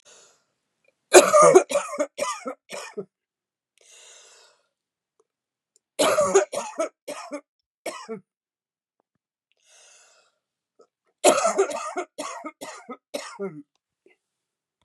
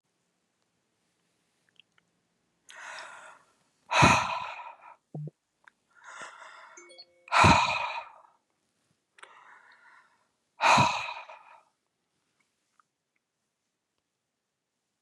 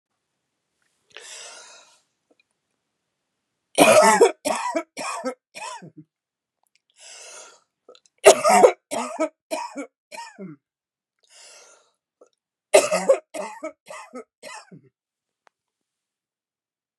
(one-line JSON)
{"cough_length": "14.8 s", "cough_amplitude": 32768, "cough_signal_mean_std_ratio": 0.29, "exhalation_length": "15.0 s", "exhalation_amplitude": 16610, "exhalation_signal_mean_std_ratio": 0.27, "three_cough_length": "17.0 s", "three_cough_amplitude": 32768, "three_cough_signal_mean_std_ratio": 0.28, "survey_phase": "beta (2021-08-13 to 2022-03-07)", "age": "45-64", "gender": "Female", "wearing_mask": "No", "symptom_cough_any": true, "symptom_runny_or_blocked_nose": true, "symptom_sore_throat": true, "symptom_fatigue": true, "symptom_headache": true, "smoker_status": "Never smoked", "respiratory_condition_asthma": false, "respiratory_condition_other": false, "recruitment_source": "Test and Trace", "submission_delay": "2 days", "covid_test_result": "Positive", "covid_test_method": "LFT"}